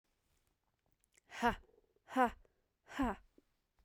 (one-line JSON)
{"exhalation_length": "3.8 s", "exhalation_amplitude": 3870, "exhalation_signal_mean_std_ratio": 0.28, "survey_phase": "beta (2021-08-13 to 2022-03-07)", "age": "45-64", "gender": "Female", "wearing_mask": "No", "symptom_cough_any": true, "symptom_new_continuous_cough": true, "symptom_runny_or_blocked_nose": true, "symptom_shortness_of_breath": true, "symptom_sore_throat": true, "symptom_fatigue": true, "symptom_headache": true, "symptom_change_to_sense_of_smell_or_taste": true, "symptom_loss_of_taste": true, "symptom_onset": "3 days", "smoker_status": "Ex-smoker", "respiratory_condition_asthma": false, "respiratory_condition_other": false, "recruitment_source": "Test and Trace", "submission_delay": "1 day", "covid_test_result": "Positive", "covid_test_method": "RT-qPCR", "covid_ct_value": 28.8, "covid_ct_gene": "N gene"}